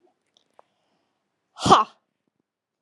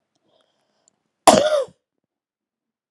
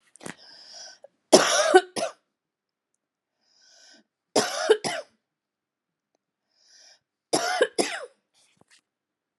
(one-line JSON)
{"exhalation_length": "2.8 s", "exhalation_amplitude": 28452, "exhalation_signal_mean_std_ratio": 0.2, "cough_length": "2.9 s", "cough_amplitude": 32768, "cough_signal_mean_std_ratio": 0.25, "three_cough_length": "9.4 s", "three_cough_amplitude": 30291, "three_cough_signal_mean_std_ratio": 0.29, "survey_phase": "beta (2021-08-13 to 2022-03-07)", "age": "45-64", "gender": "Female", "wearing_mask": "No", "symptom_cough_any": true, "symptom_sore_throat": true, "smoker_status": "Never smoked", "respiratory_condition_asthma": false, "respiratory_condition_other": false, "recruitment_source": "Test and Trace", "submission_delay": "2 days", "covid_test_result": "Positive", "covid_test_method": "ePCR"}